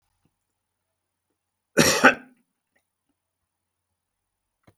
{"cough_length": "4.8 s", "cough_amplitude": 32128, "cough_signal_mean_std_ratio": 0.19, "survey_phase": "beta (2021-08-13 to 2022-03-07)", "age": "65+", "gender": "Male", "wearing_mask": "No", "symptom_none": true, "smoker_status": "Never smoked", "respiratory_condition_asthma": false, "respiratory_condition_other": false, "recruitment_source": "REACT", "submission_delay": "2 days", "covid_test_result": "Negative", "covid_test_method": "RT-qPCR", "influenza_a_test_result": "Negative", "influenza_b_test_result": "Negative"}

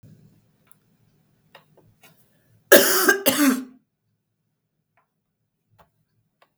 {"cough_length": "6.6 s", "cough_amplitude": 32768, "cough_signal_mean_std_ratio": 0.26, "survey_phase": "beta (2021-08-13 to 2022-03-07)", "age": "65+", "gender": "Female", "wearing_mask": "No", "symptom_none": true, "smoker_status": "Ex-smoker", "respiratory_condition_asthma": false, "respiratory_condition_other": false, "recruitment_source": "REACT", "submission_delay": "2 days", "covid_test_result": "Negative", "covid_test_method": "RT-qPCR", "influenza_a_test_result": "Negative", "influenza_b_test_result": "Negative"}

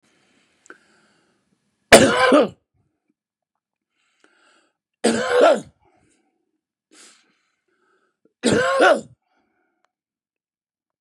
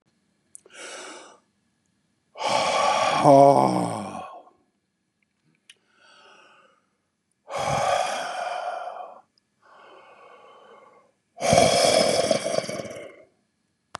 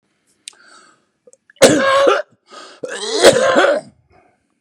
{"three_cough_length": "11.0 s", "three_cough_amplitude": 32768, "three_cough_signal_mean_std_ratio": 0.29, "exhalation_length": "14.0 s", "exhalation_amplitude": 24557, "exhalation_signal_mean_std_ratio": 0.42, "cough_length": "4.6 s", "cough_amplitude": 32768, "cough_signal_mean_std_ratio": 0.45, "survey_phase": "beta (2021-08-13 to 2022-03-07)", "age": "65+", "gender": "Male", "wearing_mask": "No", "symptom_cough_any": true, "symptom_runny_or_blocked_nose": true, "symptom_onset": "9 days", "smoker_status": "Ex-smoker", "respiratory_condition_asthma": false, "respiratory_condition_other": true, "recruitment_source": "Test and Trace", "submission_delay": "1 day", "covid_test_result": "Positive", "covid_test_method": "RT-qPCR", "covid_ct_value": 21.0, "covid_ct_gene": "ORF1ab gene", "covid_ct_mean": 21.3, "covid_viral_load": "100000 copies/ml", "covid_viral_load_category": "Low viral load (10K-1M copies/ml)"}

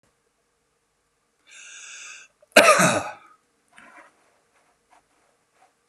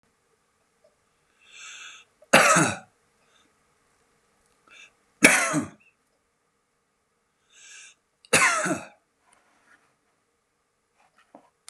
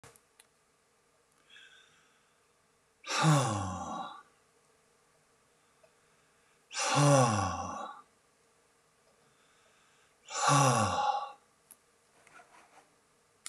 {"cough_length": "5.9 s", "cough_amplitude": 32767, "cough_signal_mean_std_ratio": 0.23, "three_cough_length": "11.7 s", "three_cough_amplitude": 32767, "three_cough_signal_mean_std_ratio": 0.25, "exhalation_length": "13.5 s", "exhalation_amplitude": 8198, "exhalation_signal_mean_std_ratio": 0.36, "survey_phase": "beta (2021-08-13 to 2022-03-07)", "age": "65+", "gender": "Male", "wearing_mask": "No", "symptom_cough_any": true, "symptom_runny_or_blocked_nose": true, "symptom_fatigue": true, "symptom_change_to_sense_of_smell_or_taste": true, "symptom_loss_of_taste": true, "symptom_onset": "6 days", "smoker_status": "Never smoked", "respiratory_condition_asthma": false, "respiratory_condition_other": false, "recruitment_source": "Test and Trace", "submission_delay": "2 days", "covid_test_result": "Positive", "covid_test_method": "RT-qPCR", "covid_ct_value": 22.3, "covid_ct_gene": "ORF1ab gene", "covid_ct_mean": 23.2, "covid_viral_load": "25000 copies/ml", "covid_viral_load_category": "Low viral load (10K-1M copies/ml)"}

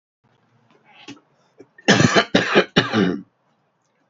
{"cough_length": "4.1 s", "cough_amplitude": 29256, "cough_signal_mean_std_ratio": 0.38, "survey_phase": "beta (2021-08-13 to 2022-03-07)", "age": "45-64", "gender": "Male", "wearing_mask": "No", "symptom_cough_any": true, "symptom_sore_throat": true, "symptom_headache": true, "smoker_status": "Ex-smoker", "respiratory_condition_asthma": false, "respiratory_condition_other": false, "recruitment_source": "Test and Trace", "submission_delay": "1 day", "covid_test_result": "Positive", "covid_test_method": "RT-qPCR", "covid_ct_value": 27.2, "covid_ct_gene": "N gene"}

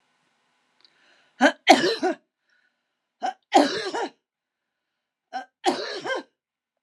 {"three_cough_length": "6.8 s", "three_cough_amplitude": 31602, "three_cough_signal_mean_std_ratio": 0.32, "survey_phase": "beta (2021-08-13 to 2022-03-07)", "age": "65+", "gender": "Female", "wearing_mask": "No", "symptom_none": true, "smoker_status": "Ex-smoker", "respiratory_condition_asthma": false, "respiratory_condition_other": false, "recruitment_source": "REACT", "submission_delay": "2 days", "covid_test_result": "Negative", "covid_test_method": "RT-qPCR", "influenza_a_test_result": "Negative", "influenza_b_test_result": "Negative"}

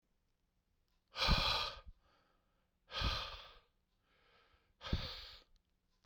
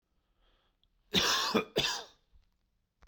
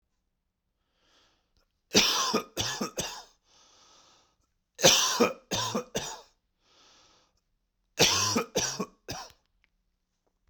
{"exhalation_length": "6.1 s", "exhalation_amplitude": 3670, "exhalation_signal_mean_std_ratio": 0.37, "cough_length": "3.1 s", "cough_amplitude": 6963, "cough_signal_mean_std_ratio": 0.4, "three_cough_length": "10.5 s", "three_cough_amplitude": 16473, "three_cough_signal_mean_std_ratio": 0.37, "survey_phase": "beta (2021-08-13 to 2022-03-07)", "age": "18-44", "gender": "Male", "wearing_mask": "No", "symptom_cough_any": true, "symptom_new_continuous_cough": true, "symptom_runny_or_blocked_nose": true, "symptom_shortness_of_breath": true, "symptom_sore_throat": true, "symptom_abdominal_pain": true, "symptom_diarrhoea": true, "symptom_fatigue": true, "symptom_fever_high_temperature": true, "symptom_headache": true, "symptom_change_to_sense_of_smell_or_taste": true, "symptom_other": true, "symptom_onset": "2 days", "smoker_status": "Ex-smoker", "respiratory_condition_asthma": false, "respiratory_condition_other": false, "recruitment_source": "Test and Trace", "submission_delay": "2 days", "covid_test_result": "Positive", "covid_test_method": "ePCR"}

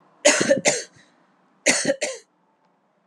{"three_cough_length": "3.1 s", "three_cough_amplitude": 28660, "three_cough_signal_mean_std_ratio": 0.41, "survey_phase": "alpha (2021-03-01 to 2021-08-12)", "age": "45-64", "gender": "Female", "wearing_mask": "No", "symptom_fatigue": true, "symptom_headache": true, "smoker_status": "Never smoked", "respiratory_condition_asthma": false, "respiratory_condition_other": false, "recruitment_source": "Test and Trace", "submission_delay": "0 days", "covid_test_result": "Positive", "covid_test_method": "LFT"}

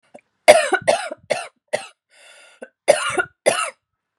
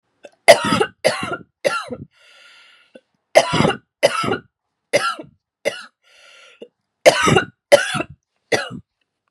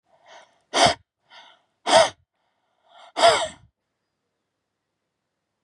{"cough_length": "4.2 s", "cough_amplitude": 32768, "cough_signal_mean_std_ratio": 0.36, "three_cough_length": "9.3 s", "three_cough_amplitude": 32768, "three_cough_signal_mean_std_ratio": 0.36, "exhalation_length": "5.6 s", "exhalation_amplitude": 28485, "exhalation_signal_mean_std_ratio": 0.28, "survey_phase": "beta (2021-08-13 to 2022-03-07)", "age": "18-44", "gender": "Female", "wearing_mask": "No", "symptom_runny_or_blocked_nose": true, "symptom_fatigue": true, "symptom_fever_high_temperature": true, "symptom_headache": true, "smoker_status": "Never smoked", "respiratory_condition_asthma": false, "respiratory_condition_other": false, "recruitment_source": "Test and Trace", "submission_delay": "1 day", "covid_test_result": "Positive", "covid_test_method": "RT-qPCR", "covid_ct_value": 28.5, "covid_ct_gene": "N gene"}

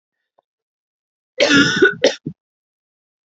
{"cough_length": "3.2 s", "cough_amplitude": 32229, "cough_signal_mean_std_ratio": 0.35, "survey_phase": "alpha (2021-03-01 to 2021-08-12)", "age": "18-44", "gender": "Female", "wearing_mask": "No", "symptom_none": true, "smoker_status": "Never smoked", "respiratory_condition_asthma": false, "respiratory_condition_other": false, "recruitment_source": "REACT", "submission_delay": "2 days", "covid_test_result": "Negative", "covid_test_method": "RT-qPCR"}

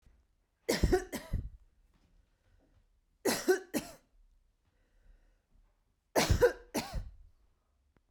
{"three_cough_length": "8.1 s", "three_cough_amplitude": 7880, "three_cough_signal_mean_std_ratio": 0.33, "survey_phase": "beta (2021-08-13 to 2022-03-07)", "age": "45-64", "gender": "Female", "wearing_mask": "No", "symptom_none": true, "smoker_status": "Ex-smoker", "respiratory_condition_asthma": false, "respiratory_condition_other": false, "recruitment_source": "REACT", "submission_delay": "0 days", "covid_test_result": "Negative", "covid_test_method": "RT-qPCR"}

